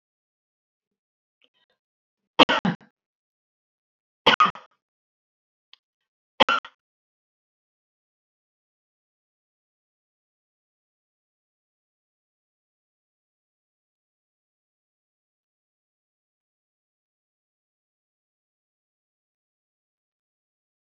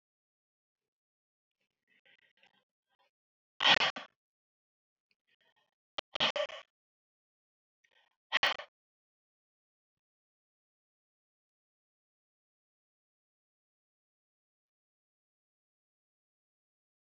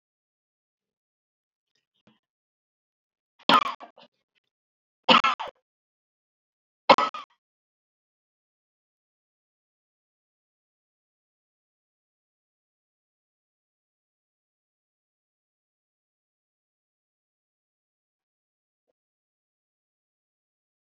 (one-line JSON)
{"cough_length": "21.0 s", "cough_amplitude": 28513, "cough_signal_mean_std_ratio": 0.11, "exhalation_length": "17.1 s", "exhalation_amplitude": 7963, "exhalation_signal_mean_std_ratio": 0.15, "three_cough_length": "21.0 s", "three_cough_amplitude": 27477, "three_cough_signal_mean_std_ratio": 0.12, "survey_phase": "alpha (2021-03-01 to 2021-08-12)", "age": "65+", "gender": "Female", "wearing_mask": "No", "symptom_none": true, "smoker_status": "Never smoked", "respiratory_condition_asthma": false, "respiratory_condition_other": false, "recruitment_source": "REACT", "submission_delay": "3 days", "covid_test_result": "Negative", "covid_test_method": "RT-qPCR"}